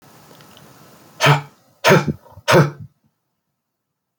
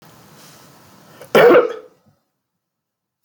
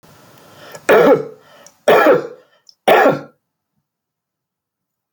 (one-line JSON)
{"exhalation_length": "4.2 s", "exhalation_amplitude": 29395, "exhalation_signal_mean_std_ratio": 0.33, "cough_length": "3.2 s", "cough_amplitude": 28964, "cough_signal_mean_std_ratio": 0.29, "three_cough_length": "5.1 s", "three_cough_amplitude": 29548, "three_cough_signal_mean_std_ratio": 0.38, "survey_phase": "alpha (2021-03-01 to 2021-08-12)", "age": "45-64", "gender": "Male", "wearing_mask": "No", "symptom_none": true, "smoker_status": "Never smoked", "respiratory_condition_asthma": false, "respiratory_condition_other": false, "recruitment_source": "REACT", "submission_delay": "3 days", "covid_test_result": "Negative", "covid_test_method": "RT-qPCR"}